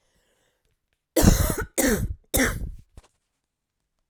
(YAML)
three_cough_length: 4.1 s
three_cough_amplitude: 25214
three_cough_signal_mean_std_ratio: 0.4
survey_phase: alpha (2021-03-01 to 2021-08-12)
age: 18-44
gender: Female
wearing_mask: 'No'
symptom_cough_any: true
symptom_headache: true
smoker_status: Never smoked
respiratory_condition_asthma: false
respiratory_condition_other: false
recruitment_source: Test and Trace
submission_delay: 2 days
covid_test_result: Positive
covid_test_method: RT-qPCR
covid_ct_value: 24.6
covid_ct_gene: N gene